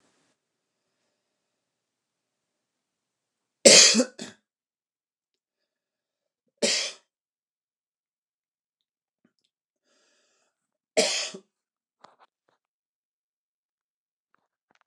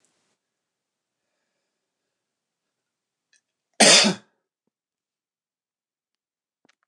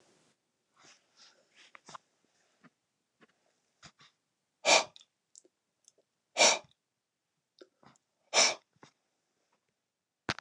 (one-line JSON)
{"three_cough_length": "14.9 s", "three_cough_amplitude": 29203, "three_cough_signal_mean_std_ratio": 0.17, "cough_length": "6.9 s", "cough_amplitude": 28738, "cough_signal_mean_std_ratio": 0.17, "exhalation_length": "10.4 s", "exhalation_amplitude": 10375, "exhalation_signal_mean_std_ratio": 0.19, "survey_phase": "beta (2021-08-13 to 2022-03-07)", "age": "65+", "gender": "Male", "wearing_mask": "No", "symptom_cough_any": true, "symptom_runny_or_blocked_nose": true, "smoker_status": "Never smoked", "respiratory_condition_asthma": false, "respiratory_condition_other": false, "recruitment_source": "Test and Trace", "submission_delay": "1 day", "covid_test_result": "Negative", "covid_test_method": "RT-qPCR"}